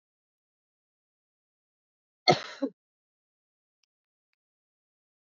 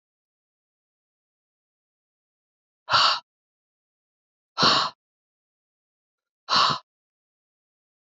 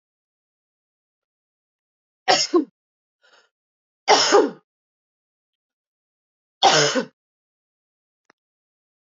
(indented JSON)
{
  "cough_length": "5.3 s",
  "cough_amplitude": 16686,
  "cough_signal_mean_std_ratio": 0.13,
  "exhalation_length": "8.0 s",
  "exhalation_amplitude": 16524,
  "exhalation_signal_mean_std_ratio": 0.26,
  "three_cough_length": "9.1 s",
  "three_cough_amplitude": 26554,
  "three_cough_signal_mean_std_ratio": 0.27,
  "survey_phase": "alpha (2021-03-01 to 2021-08-12)",
  "age": "45-64",
  "gender": "Female",
  "wearing_mask": "No",
  "symptom_cough_any": true,
  "smoker_status": "Never smoked",
  "respiratory_condition_asthma": false,
  "respiratory_condition_other": false,
  "recruitment_source": "Test and Trace",
  "submission_delay": "2 days",
  "covid_test_result": "Positive",
  "covid_test_method": "RT-qPCR",
  "covid_ct_value": 13.9,
  "covid_ct_gene": "ORF1ab gene",
  "covid_ct_mean": 14.3,
  "covid_viral_load": "21000000 copies/ml",
  "covid_viral_load_category": "High viral load (>1M copies/ml)"
}